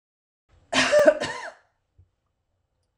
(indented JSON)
{
  "cough_length": "3.0 s",
  "cough_amplitude": 21996,
  "cough_signal_mean_std_ratio": 0.34,
  "survey_phase": "beta (2021-08-13 to 2022-03-07)",
  "age": "45-64",
  "gender": "Female",
  "wearing_mask": "No",
  "symptom_none": true,
  "smoker_status": "Never smoked",
  "respiratory_condition_asthma": false,
  "respiratory_condition_other": false,
  "recruitment_source": "REACT",
  "submission_delay": "1 day",
  "covid_test_result": "Negative",
  "covid_test_method": "RT-qPCR",
  "influenza_a_test_result": "Negative",
  "influenza_b_test_result": "Negative"
}